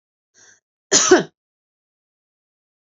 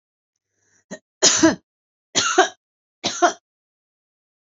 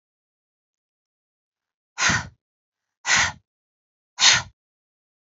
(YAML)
cough_length: 2.8 s
cough_amplitude: 29850
cough_signal_mean_std_ratio: 0.25
three_cough_length: 4.4 s
three_cough_amplitude: 30991
three_cough_signal_mean_std_ratio: 0.32
exhalation_length: 5.4 s
exhalation_amplitude: 25815
exhalation_signal_mean_std_ratio: 0.27
survey_phase: alpha (2021-03-01 to 2021-08-12)
age: 45-64
gender: Female
wearing_mask: 'No'
symptom_none: true
symptom_onset: 1 day
smoker_status: Never smoked
respiratory_condition_asthma: false
respiratory_condition_other: false
recruitment_source: Test and Trace
submission_delay: 0 days
covid_test_result: Negative
covid_test_method: RT-qPCR